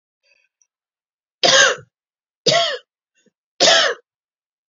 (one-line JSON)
{"three_cough_length": "4.7 s", "three_cough_amplitude": 32218, "three_cough_signal_mean_std_ratio": 0.36, "survey_phase": "beta (2021-08-13 to 2022-03-07)", "age": "18-44", "gender": "Female", "wearing_mask": "No", "symptom_none": true, "smoker_status": "Never smoked", "respiratory_condition_asthma": false, "respiratory_condition_other": false, "recruitment_source": "REACT", "submission_delay": "1 day", "covid_test_result": "Negative", "covid_test_method": "RT-qPCR"}